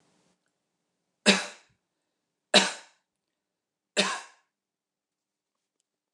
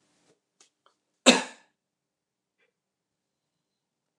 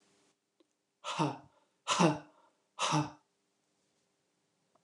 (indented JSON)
{
  "three_cough_length": "6.1 s",
  "three_cough_amplitude": 17716,
  "three_cough_signal_mean_std_ratio": 0.21,
  "cough_length": "4.2 s",
  "cough_amplitude": 29203,
  "cough_signal_mean_std_ratio": 0.14,
  "exhalation_length": "4.8 s",
  "exhalation_amplitude": 7183,
  "exhalation_signal_mean_std_ratio": 0.32,
  "survey_phase": "beta (2021-08-13 to 2022-03-07)",
  "age": "65+",
  "gender": "Female",
  "wearing_mask": "No",
  "symptom_none": true,
  "smoker_status": "Never smoked",
  "respiratory_condition_asthma": true,
  "respiratory_condition_other": false,
  "recruitment_source": "REACT",
  "submission_delay": "1 day",
  "covid_test_result": "Negative",
  "covid_test_method": "RT-qPCR"
}